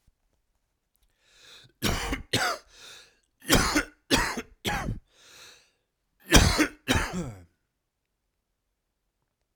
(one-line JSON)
{"cough_length": "9.6 s", "cough_amplitude": 28385, "cough_signal_mean_std_ratio": 0.36, "survey_phase": "alpha (2021-03-01 to 2021-08-12)", "age": "45-64", "gender": "Male", "wearing_mask": "No", "symptom_cough_any": true, "symptom_shortness_of_breath": true, "symptom_fatigue": true, "symptom_headache": true, "symptom_onset": "3 days", "smoker_status": "Ex-smoker", "respiratory_condition_asthma": false, "respiratory_condition_other": false, "recruitment_source": "Test and Trace", "submission_delay": "2 days", "covid_test_result": "Positive", "covid_test_method": "RT-qPCR", "covid_ct_value": 23.4, "covid_ct_gene": "ORF1ab gene", "covid_ct_mean": 24.3, "covid_viral_load": "11000 copies/ml", "covid_viral_load_category": "Low viral load (10K-1M copies/ml)"}